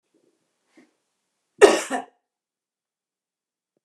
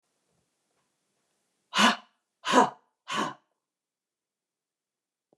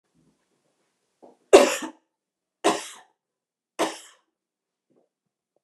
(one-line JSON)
{"cough_length": "3.8 s", "cough_amplitude": 29204, "cough_signal_mean_std_ratio": 0.18, "exhalation_length": "5.4 s", "exhalation_amplitude": 19158, "exhalation_signal_mean_std_ratio": 0.25, "three_cough_length": "5.6 s", "three_cough_amplitude": 29204, "three_cough_signal_mean_std_ratio": 0.2, "survey_phase": "beta (2021-08-13 to 2022-03-07)", "age": "65+", "gender": "Female", "wearing_mask": "No", "symptom_cough_any": true, "smoker_status": "Never smoked", "respiratory_condition_asthma": false, "respiratory_condition_other": false, "recruitment_source": "REACT", "submission_delay": "2 days", "covid_test_result": "Negative", "covid_test_method": "RT-qPCR", "influenza_a_test_result": "Negative", "influenza_b_test_result": "Negative"}